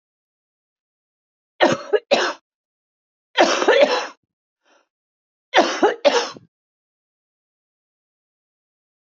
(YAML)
cough_length: 9.0 s
cough_amplitude: 28282
cough_signal_mean_std_ratio: 0.32
survey_phase: alpha (2021-03-01 to 2021-08-12)
age: 45-64
gender: Female
wearing_mask: 'No'
symptom_cough_any: true
symptom_shortness_of_breath: true
symptom_fatigue: true
symptom_headache: true
symptom_change_to_sense_of_smell_or_taste: true
symptom_onset: 4 days
smoker_status: Current smoker (1 to 10 cigarettes per day)
respiratory_condition_asthma: false
respiratory_condition_other: true
recruitment_source: Test and Trace
submission_delay: 2 days
covid_test_result: Positive
covid_test_method: RT-qPCR
covid_ct_value: 12.9
covid_ct_gene: N gene
covid_ct_mean: 13.6
covid_viral_load: 35000000 copies/ml
covid_viral_load_category: High viral load (>1M copies/ml)